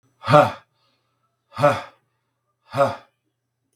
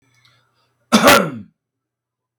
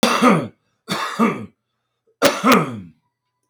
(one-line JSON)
{"exhalation_length": "3.8 s", "exhalation_amplitude": 32768, "exhalation_signal_mean_std_ratio": 0.3, "cough_length": "2.4 s", "cough_amplitude": 32768, "cough_signal_mean_std_ratio": 0.31, "three_cough_length": "3.5 s", "three_cough_amplitude": 32766, "three_cough_signal_mean_std_ratio": 0.48, "survey_phase": "beta (2021-08-13 to 2022-03-07)", "age": "45-64", "gender": "Male", "wearing_mask": "No", "symptom_none": true, "smoker_status": "Ex-smoker", "respiratory_condition_asthma": true, "respiratory_condition_other": true, "recruitment_source": "REACT", "submission_delay": "4 days", "covid_test_result": "Positive", "covid_test_method": "RT-qPCR", "covid_ct_value": 36.0, "covid_ct_gene": "N gene", "influenza_a_test_result": "Negative", "influenza_b_test_result": "Negative"}